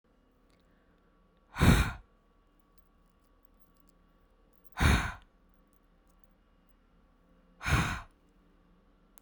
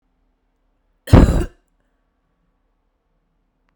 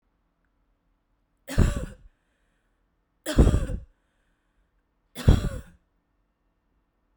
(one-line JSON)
{"exhalation_length": "9.2 s", "exhalation_amplitude": 12625, "exhalation_signal_mean_std_ratio": 0.27, "cough_length": "3.8 s", "cough_amplitude": 32768, "cough_signal_mean_std_ratio": 0.22, "three_cough_length": "7.2 s", "three_cough_amplitude": 21885, "three_cough_signal_mean_std_ratio": 0.26, "survey_phase": "beta (2021-08-13 to 2022-03-07)", "age": "18-44", "gender": "Female", "wearing_mask": "No", "symptom_cough_any": true, "symptom_runny_or_blocked_nose": true, "symptom_sore_throat": true, "symptom_change_to_sense_of_smell_or_taste": true, "symptom_loss_of_taste": true, "symptom_onset": "10 days", "smoker_status": "Never smoked", "respiratory_condition_asthma": true, "respiratory_condition_other": false, "recruitment_source": "Test and Trace", "submission_delay": "1 day", "covid_test_result": "Positive", "covid_test_method": "RT-qPCR", "covid_ct_value": 26.0, "covid_ct_gene": "N gene"}